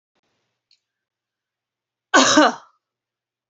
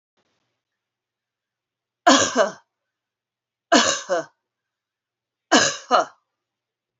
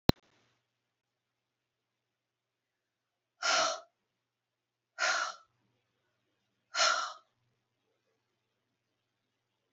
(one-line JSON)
{"cough_length": "3.5 s", "cough_amplitude": 28305, "cough_signal_mean_std_ratio": 0.26, "three_cough_length": "7.0 s", "three_cough_amplitude": 28771, "three_cough_signal_mean_std_ratio": 0.3, "exhalation_length": "9.7 s", "exhalation_amplitude": 19591, "exhalation_signal_mean_std_ratio": 0.23, "survey_phase": "beta (2021-08-13 to 2022-03-07)", "age": "45-64", "gender": "Female", "wearing_mask": "No", "symptom_none": true, "smoker_status": "Ex-smoker", "respiratory_condition_asthma": false, "respiratory_condition_other": false, "recruitment_source": "REACT", "submission_delay": "10 days", "covid_test_result": "Negative", "covid_test_method": "RT-qPCR", "influenza_a_test_result": "Negative", "influenza_b_test_result": "Negative"}